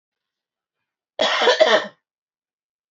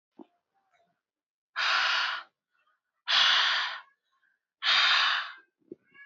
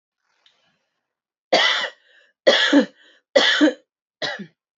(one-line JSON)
{"cough_length": "2.9 s", "cough_amplitude": 27991, "cough_signal_mean_std_ratio": 0.36, "exhalation_length": "6.1 s", "exhalation_amplitude": 9075, "exhalation_signal_mean_std_ratio": 0.48, "three_cough_length": "4.8 s", "three_cough_amplitude": 28668, "three_cough_signal_mean_std_ratio": 0.4, "survey_phase": "beta (2021-08-13 to 2022-03-07)", "age": "18-44", "gender": "Female", "wearing_mask": "No", "symptom_none": true, "symptom_onset": "12 days", "smoker_status": "Never smoked", "respiratory_condition_asthma": false, "respiratory_condition_other": false, "recruitment_source": "REACT", "submission_delay": "2 days", "covid_test_result": "Negative", "covid_test_method": "RT-qPCR", "influenza_a_test_result": "Negative", "influenza_b_test_result": "Negative"}